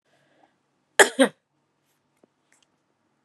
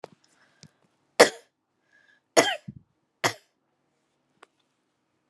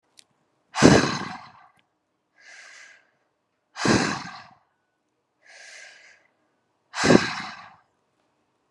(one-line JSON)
{"cough_length": "3.2 s", "cough_amplitude": 28301, "cough_signal_mean_std_ratio": 0.17, "three_cough_length": "5.3 s", "three_cough_amplitude": 30444, "three_cough_signal_mean_std_ratio": 0.17, "exhalation_length": "8.7 s", "exhalation_amplitude": 32767, "exhalation_signal_mean_std_ratio": 0.28, "survey_phase": "beta (2021-08-13 to 2022-03-07)", "age": "18-44", "gender": "Female", "wearing_mask": "No", "symptom_none": true, "smoker_status": "Never smoked", "respiratory_condition_asthma": false, "respiratory_condition_other": false, "recruitment_source": "REACT", "submission_delay": "1 day", "covid_test_result": "Negative", "covid_test_method": "RT-qPCR", "influenza_a_test_result": "Negative", "influenza_b_test_result": "Negative"}